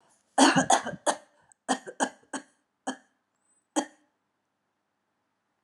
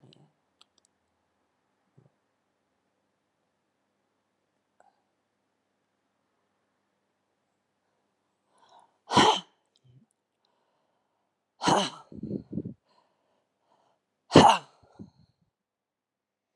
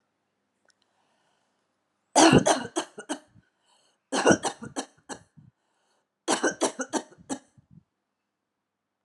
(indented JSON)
{
  "cough_length": "5.6 s",
  "cough_amplitude": 19320,
  "cough_signal_mean_std_ratio": 0.29,
  "exhalation_length": "16.6 s",
  "exhalation_amplitude": 29180,
  "exhalation_signal_mean_std_ratio": 0.17,
  "three_cough_length": "9.0 s",
  "three_cough_amplitude": 21679,
  "three_cough_signal_mean_std_ratio": 0.29,
  "survey_phase": "alpha (2021-03-01 to 2021-08-12)",
  "age": "45-64",
  "gender": "Female",
  "wearing_mask": "No",
  "symptom_fatigue": true,
  "symptom_headache": true,
  "symptom_change_to_sense_of_smell_or_taste": true,
  "smoker_status": "Never smoked",
  "respiratory_condition_asthma": false,
  "respiratory_condition_other": false,
  "recruitment_source": "Test and Trace",
  "submission_delay": "1 day",
  "covid_test_result": "Positive",
  "covid_test_method": "RT-qPCR"
}